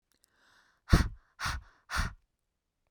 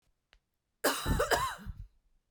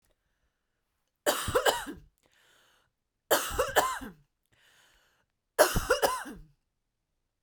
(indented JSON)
{
  "exhalation_length": "2.9 s",
  "exhalation_amplitude": 14682,
  "exhalation_signal_mean_std_ratio": 0.28,
  "cough_length": "2.3 s",
  "cough_amplitude": 6827,
  "cough_signal_mean_std_ratio": 0.47,
  "three_cough_length": "7.4 s",
  "three_cough_amplitude": 15517,
  "three_cough_signal_mean_std_ratio": 0.35,
  "survey_phase": "beta (2021-08-13 to 2022-03-07)",
  "age": "18-44",
  "gender": "Female",
  "wearing_mask": "No",
  "symptom_none": true,
  "smoker_status": "Never smoked",
  "respiratory_condition_asthma": false,
  "respiratory_condition_other": false,
  "recruitment_source": "REACT",
  "submission_delay": "2 days",
  "covid_test_result": "Negative",
  "covid_test_method": "RT-qPCR"
}